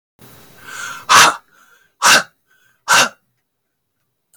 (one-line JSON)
{"exhalation_length": "4.4 s", "exhalation_amplitude": 32768, "exhalation_signal_mean_std_ratio": 0.34, "survey_phase": "beta (2021-08-13 to 2022-03-07)", "age": "45-64", "gender": "Male", "wearing_mask": "No", "symptom_none": true, "smoker_status": "Ex-smoker", "respiratory_condition_asthma": false, "respiratory_condition_other": false, "recruitment_source": "REACT", "submission_delay": "1 day", "covid_test_result": "Negative", "covid_test_method": "RT-qPCR", "influenza_a_test_result": "Negative", "influenza_b_test_result": "Negative"}